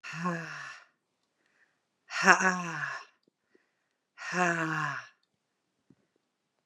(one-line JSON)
{"exhalation_length": "6.7 s", "exhalation_amplitude": 23160, "exhalation_signal_mean_std_ratio": 0.36, "survey_phase": "beta (2021-08-13 to 2022-03-07)", "age": "45-64", "gender": "Female", "wearing_mask": "No", "symptom_cough_any": true, "symptom_sore_throat": true, "symptom_onset": "3 days", "smoker_status": "Ex-smoker", "respiratory_condition_asthma": false, "respiratory_condition_other": false, "recruitment_source": "Test and Trace", "submission_delay": "2 days", "covid_test_result": "Negative", "covid_test_method": "RT-qPCR"}